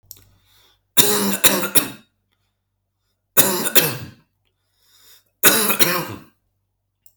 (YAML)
three_cough_length: 7.2 s
three_cough_amplitude: 32768
three_cough_signal_mean_std_ratio: 0.38
survey_phase: alpha (2021-03-01 to 2021-08-12)
age: 18-44
gender: Male
wearing_mask: 'No'
symptom_none: true
symptom_onset: 8 days
smoker_status: Never smoked
respiratory_condition_asthma: true
respiratory_condition_other: false
recruitment_source: REACT
submission_delay: 3 days
covid_test_result: Negative
covid_test_method: RT-qPCR